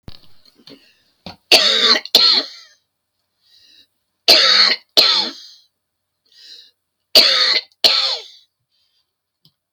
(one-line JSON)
{"three_cough_length": "9.7 s", "three_cough_amplitude": 32768, "three_cough_signal_mean_std_ratio": 0.4, "survey_phase": "beta (2021-08-13 to 2022-03-07)", "age": "65+", "gender": "Female", "wearing_mask": "No", "symptom_shortness_of_breath": true, "symptom_fatigue": true, "symptom_onset": "12 days", "smoker_status": "Never smoked", "respiratory_condition_asthma": false, "respiratory_condition_other": false, "recruitment_source": "REACT", "submission_delay": "1 day", "covid_test_result": "Negative", "covid_test_method": "RT-qPCR", "influenza_a_test_result": "Negative", "influenza_b_test_result": "Negative"}